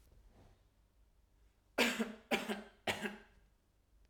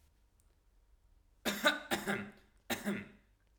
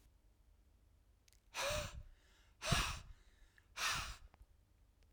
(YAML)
three_cough_length: 4.1 s
three_cough_amplitude: 4022
three_cough_signal_mean_std_ratio: 0.36
cough_length: 3.6 s
cough_amplitude: 6932
cough_signal_mean_std_ratio: 0.4
exhalation_length: 5.1 s
exhalation_amplitude: 3086
exhalation_signal_mean_std_ratio: 0.42
survey_phase: alpha (2021-03-01 to 2021-08-12)
age: 18-44
gender: Male
wearing_mask: 'No'
symptom_none: true
smoker_status: Never smoked
respiratory_condition_asthma: false
respiratory_condition_other: false
recruitment_source: REACT
submission_delay: 1 day
covid_test_result: Negative
covid_test_method: RT-qPCR